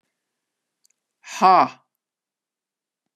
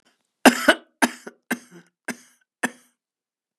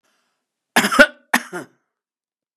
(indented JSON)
{
  "exhalation_length": "3.2 s",
  "exhalation_amplitude": 24150,
  "exhalation_signal_mean_std_ratio": 0.23,
  "three_cough_length": "3.6 s",
  "three_cough_amplitude": 32767,
  "three_cough_signal_mean_std_ratio": 0.22,
  "cough_length": "2.6 s",
  "cough_amplitude": 32768,
  "cough_signal_mean_std_ratio": 0.26,
  "survey_phase": "beta (2021-08-13 to 2022-03-07)",
  "age": "65+",
  "gender": "Female",
  "wearing_mask": "No",
  "symptom_none": true,
  "smoker_status": "Never smoked",
  "respiratory_condition_asthma": true,
  "respiratory_condition_other": false,
  "recruitment_source": "REACT",
  "submission_delay": "2 days",
  "covid_test_result": "Negative",
  "covid_test_method": "RT-qPCR",
  "influenza_a_test_result": "Negative",
  "influenza_b_test_result": "Negative"
}